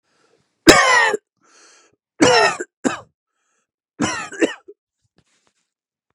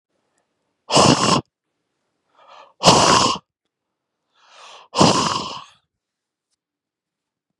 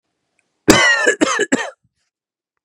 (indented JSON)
{
  "three_cough_length": "6.1 s",
  "three_cough_amplitude": 32768,
  "three_cough_signal_mean_std_ratio": 0.34,
  "exhalation_length": "7.6 s",
  "exhalation_amplitude": 32768,
  "exhalation_signal_mean_std_ratio": 0.35,
  "cough_length": "2.6 s",
  "cough_amplitude": 32768,
  "cough_signal_mean_std_ratio": 0.44,
  "survey_phase": "beta (2021-08-13 to 2022-03-07)",
  "age": "45-64",
  "gender": "Male",
  "wearing_mask": "No",
  "symptom_none": true,
  "smoker_status": "Ex-smoker",
  "respiratory_condition_asthma": false,
  "respiratory_condition_other": false,
  "recruitment_source": "REACT",
  "submission_delay": "1 day",
  "covid_test_method": "RT-qPCR"
}